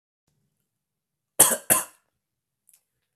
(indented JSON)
{
  "cough_length": "3.2 s",
  "cough_amplitude": 32767,
  "cough_signal_mean_std_ratio": 0.21,
  "survey_phase": "beta (2021-08-13 to 2022-03-07)",
  "age": "18-44",
  "gender": "Male",
  "wearing_mask": "No",
  "symptom_cough_any": true,
  "symptom_runny_or_blocked_nose": true,
  "symptom_fatigue": true,
  "symptom_change_to_sense_of_smell_or_taste": true,
  "symptom_loss_of_taste": true,
  "symptom_onset": "4 days",
  "smoker_status": "Never smoked",
  "respiratory_condition_asthma": false,
  "respiratory_condition_other": false,
  "recruitment_source": "Test and Trace",
  "submission_delay": "2 days",
  "covid_test_result": "Positive",
  "covid_test_method": "RT-qPCR",
  "covid_ct_value": 18.4,
  "covid_ct_gene": "ORF1ab gene",
  "covid_ct_mean": 19.2,
  "covid_viral_load": "510000 copies/ml",
  "covid_viral_load_category": "Low viral load (10K-1M copies/ml)"
}